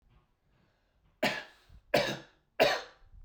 {
  "three_cough_length": "3.2 s",
  "three_cough_amplitude": 9266,
  "three_cough_signal_mean_std_ratio": 0.34,
  "survey_phase": "beta (2021-08-13 to 2022-03-07)",
  "age": "18-44",
  "gender": "Male",
  "wearing_mask": "No",
  "symptom_runny_or_blocked_nose": true,
  "symptom_onset": "4 days",
  "smoker_status": "Never smoked",
  "respiratory_condition_asthma": false,
  "respiratory_condition_other": false,
  "recruitment_source": "Test and Trace",
  "submission_delay": "2 days",
  "covid_test_result": "Positive",
  "covid_test_method": "ePCR"
}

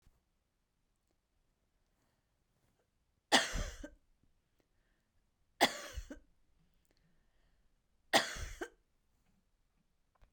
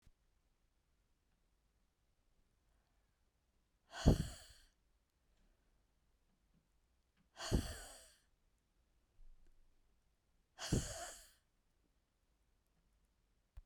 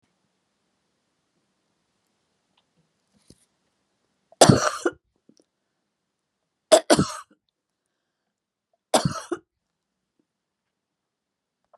{
  "cough_length": "10.3 s",
  "cough_amplitude": 9251,
  "cough_signal_mean_std_ratio": 0.21,
  "exhalation_length": "13.7 s",
  "exhalation_amplitude": 6313,
  "exhalation_signal_mean_std_ratio": 0.2,
  "three_cough_length": "11.8 s",
  "three_cough_amplitude": 32758,
  "three_cough_signal_mean_std_ratio": 0.18,
  "survey_phase": "beta (2021-08-13 to 2022-03-07)",
  "age": "65+",
  "gender": "Female",
  "wearing_mask": "No",
  "symptom_cough_any": true,
  "symptom_runny_or_blocked_nose": true,
  "smoker_status": "Never smoked",
  "respiratory_condition_asthma": false,
  "respiratory_condition_other": false,
  "recruitment_source": "REACT",
  "submission_delay": "1 day",
  "covid_test_result": "Negative",
  "covid_test_method": "RT-qPCR",
  "influenza_a_test_result": "Negative",
  "influenza_b_test_result": "Negative"
}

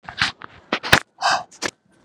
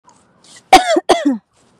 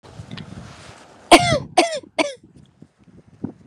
{
  "exhalation_length": "2.0 s",
  "exhalation_amplitude": 32768,
  "exhalation_signal_mean_std_ratio": 0.38,
  "cough_length": "1.8 s",
  "cough_amplitude": 32768,
  "cough_signal_mean_std_ratio": 0.4,
  "three_cough_length": "3.7 s",
  "three_cough_amplitude": 32768,
  "three_cough_signal_mean_std_ratio": 0.32,
  "survey_phase": "beta (2021-08-13 to 2022-03-07)",
  "age": "18-44",
  "gender": "Female",
  "wearing_mask": "No",
  "symptom_none": true,
  "smoker_status": "Never smoked",
  "respiratory_condition_asthma": true,
  "respiratory_condition_other": false,
  "recruitment_source": "REACT",
  "submission_delay": "2 days",
  "covid_test_result": "Negative",
  "covid_test_method": "RT-qPCR",
  "influenza_a_test_result": "Negative",
  "influenza_b_test_result": "Negative"
}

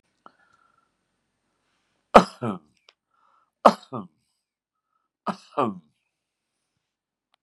{
  "three_cough_length": "7.4 s",
  "three_cough_amplitude": 32768,
  "three_cough_signal_mean_std_ratio": 0.15,
  "survey_phase": "beta (2021-08-13 to 2022-03-07)",
  "age": "65+",
  "gender": "Male",
  "wearing_mask": "No",
  "symptom_none": true,
  "smoker_status": "Ex-smoker",
  "respiratory_condition_asthma": false,
  "respiratory_condition_other": false,
  "recruitment_source": "REACT",
  "submission_delay": "2 days",
  "covid_test_result": "Negative",
  "covid_test_method": "RT-qPCR",
  "influenza_a_test_result": "Negative",
  "influenza_b_test_result": "Negative"
}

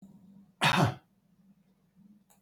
{
  "cough_length": "2.4 s",
  "cough_amplitude": 7564,
  "cough_signal_mean_std_ratio": 0.32,
  "survey_phase": "beta (2021-08-13 to 2022-03-07)",
  "age": "65+",
  "gender": "Male",
  "wearing_mask": "No",
  "symptom_none": true,
  "smoker_status": "Current smoker (11 or more cigarettes per day)",
  "respiratory_condition_asthma": false,
  "respiratory_condition_other": false,
  "recruitment_source": "REACT",
  "submission_delay": "2 days",
  "covid_test_result": "Negative",
  "covid_test_method": "RT-qPCR"
}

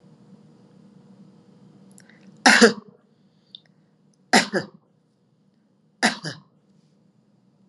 {
  "cough_length": "7.7 s",
  "cough_amplitude": 32767,
  "cough_signal_mean_std_ratio": 0.23,
  "survey_phase": "alpha (2021-03-01 to 2021-08-12)",
  "age": "45-64",
  "gender": "Female",
  "wearing_mask": "Yes",
  "symptom_none": true,
  "smoker_status": "Never smoked",
  "respiratory_condition_asthma": false,
  "respiratory_condition_other": false,
  "recruitment_source": "Test and Trace",
  "submission_delay": "0 days",
  "covid_test_result": "Negative",
  "covid_test_method": "LFT"
}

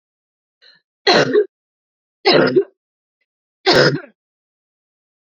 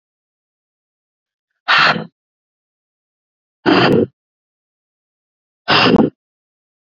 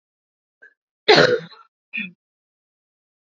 {
  "three_cough_length": "5.4 s",
  "three_cough_amplitude": 30168,
  "three_cough_signal_mean_std_ratio": 0.36,
  "exhalation_length": "6.9 s",
  "exhalation_amplitude": 30943,
  "exhalation_signal_mean_std_ratio": 0.33,
  "cough_length": "3.3 s",
  "cough_amplitude": 30317,
  "cough_signal_mean_std_ratio": 0.25,
  "survey_phase": "beta (2021-08-13 to 2022-03-07)",
  "age": "18-44",
  "gender": "Female",
  "wearing_mask": "No",
  "symptom_cough_any": true,
  "symptom_runny_or_blocked_nose": true,
  "symptom_sore_throat": true,
  "symptom_change_to_sense_of_smell_or_taste": true,
  "symptom_loss_of_taste": true,
  "smoker_status": "Never smoked",
  "respiratory_condition_asthma": false,
  "respiratory_condition_other": false,
  "recruitment_source": "Test and Trace",
  "submission_delay": "2 days",
  "covid_test_result": "Positive",
  "covid_test_method": "LFT"
}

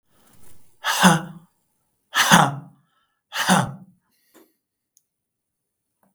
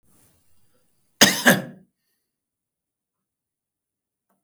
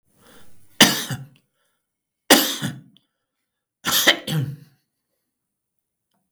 {
  "exhalation_length": "6.1 s",
  "exhalation_amplitude": 32768,
  "exhalation_signal_mean_std_ratio": 0.32,
  "cough_length": "4.4 s",
  "cough_amplitude": 32768,
  "cough_signal_mean_std_ratio": 0.2,
  "three_cough_length": "6.3 s",
  "three_cough_amplitude": 32768,
  "three_cough_signal_mean_std_ratio": 0.31,
  "survey_phase": "beta (2021-08-13 to 2022-03-07)",
  "age": "65+",
  "gender": "Male",
  "wearing_mask": "No",
  "symptom_runny_or_blocked_nose": true,
  "smoker_status": "Ex-smoker",
  "respiratory_condition_asthma": false,
  "respiratory_condition_other": false,
  "recruitment_source": "REACT",
  "submission_delay": "2 days",
  "covid_test_result": "Negative",
  "covid_test_method": "RT-qPCR",
  "influenza_a_test_result": "Unknown/Void",
  "influenza_b_test_result": "Unknown/Void"
}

